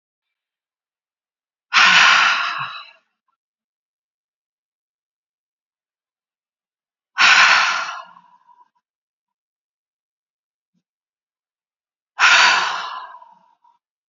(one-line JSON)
{"exhalation_length": "14.1 s", "exhalation_amplitude": 32767, "exhalation_signal_mean_std_ratio": 0.32, "survey_phase": "beta (2021-08-13 to 2022-03-07)", "age": "45-64", "gender": "Female", "wearing_mask": "No", "symptom_none": true, "smoker_status": "Ex-smoker", "respiratory_condition_asthma": false, "respiratory_condition_other": false, "recruitment_source": "REACT", "submission_delay": "5 days", "covid_test_result": "Negative", "covid_test_method": "RT-qPCR", "influenza_a_test_result": "Negative", "influenza_b_test_result": "Negative"}